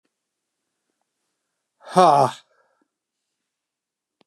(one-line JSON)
{"exhalation_length": "4.3 s", "exhalation_amplitude": 27318, "exhalation_signal_mean_std_ratio": 0.21, "survey_phase": "beta (2021-08-13 to 2022-03-07)", "age": "65+", "gender": "Male", "wearing_mask": "No", "symptom_none": true, "symptom_onset": "12 days", "smoker_status": "Never smoked", "respiratory_condition_asthma": false, "respiratory_condition_other": false, "recruitment_source": "REACT", "submission_delay": "2 days", "covid_test_result": "Negative", "covid_test_method": "RT-qPCR", "influenza_a_test_result": "Negative", "influenza_b_test_result": "Negative"}